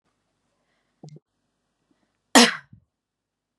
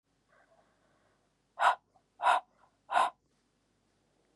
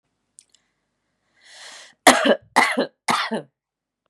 {
  "cough_length": "3.6 s",
  "cough_amplitude": 30386,
  "cough_signal_mean_std_ratio": 0.17,
  "exhalation_length": "4.4 s",
  "exhalation_amplitude": 8098,
  "exhalation_signal_mean_std_ratio": 0.27,
  "three_cough_length": "4.1 s",
  "three_cough_amplitude": 32768,
  "three_cough_signal_mean_std_ratio": 0.32,
  "survey_phase": "beta (2021-08-13 to 2022-03-07)",
  "age": "18-44",
  "gender": "Female",
  "wearing_mask": "No",
  "symptom_fatigue": true,
  "symptom_onset": "12 days",
  "smoker_status": "Current smoker (11 or more cigarettes per day)",
  "respiratory_condition_asthma": true,
  "respiratory_condition_other": false,
  "recruitment_source": "REACT",
  "submission_delay": "1 day",
  "covid_test_result": "Negative",
  "covid_test_method": "RT-qPCR",
  "influenza_a_test_result": "Negative",
  "influenza_b_test_result": "Negative"
}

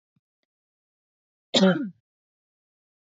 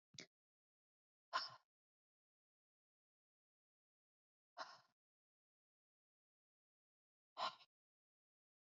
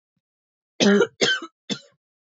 {
  "cough_length": "3.1 s",
  "cough_amplitude": 17203,
  "cough_signal_mean_std_ratio": 0.24,
  "exhalation_length": "8.6 s",
  "exhalation_amplitude": 1265,
  "exhalation_signal_mean_std_ratio": 0.17,
  "three_cough_length": "2.3 s",
  "three_cough_amplitude": 20878,
  "three_cough_signal_mean_std_ratio": 0.38,
  "survey_phase": "beta (2021-08-13 to 2022-03-07)",
  "age": "18-44",
  "gender": "Female",
  "wearing_mask": "No",
  "symptom_none": true,
  "smoker_status": "Ex-smoker",
  "respiratory_condition_asthma": false,
  "respiratory_condition_other": false,
  "recruitment_source": "REACT",
  "submission_delay": "3 days",
  "covid_test_result": "Negative",
  "covid_test_method": "RT-qPCR",
  "influenza_a_test_result": "Negative",
  "influenza_b_test_result": "Negative"
}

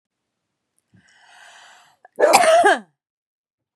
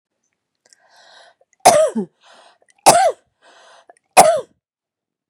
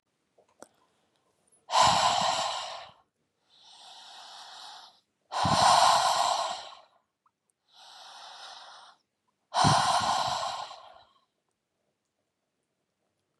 {
  "cough_length": "3.8 s",
  "cough_amplitude": 32768,
  "cough_signal_mean_std_ratio": 0.34,
  "three_cough_length": "5.3 s",
  "three_cough_amplitude": 32768,
  "three_cough_signal_mean_std_ratio": 0.31,
  "exhalation_length": "13.4 s",
  "exhalation_amplitude": 12201,
  "exhalation_signal_mean_std_ratio": 0.42,
  "survey_phase": "beta (2021-08-13 to 2022-03-07)",
  "age": "18-44",
  "gender": "Female",
  "wearing_mask": "No",
  "symptom_cough_any": true,
  "symptom_runny_or_blocked_nose": true,
  "symptom_sore_throat": true,
  "symptom_headache": true,
  "symptom_change_to_sense_of_smell_or_taste": true,
  "symptom_onset": "6 days",
  "smoker_status": "Current smoker (11 or more cigarettes per day)",
  "respiratory_condition_asthma": false,
  "respiratory_condition_other": false,
  "recruitment_source": "REACT",
  "submission_delay": "3 days",
  "covid_test_result": "Negative",
  "covid_test_method": "RT-qPCR",
  "influenza_a_test_result": "Positive",
  "influenza_a_ct_value": 30.2,
  "influenza_b_test_result": "Negative"
}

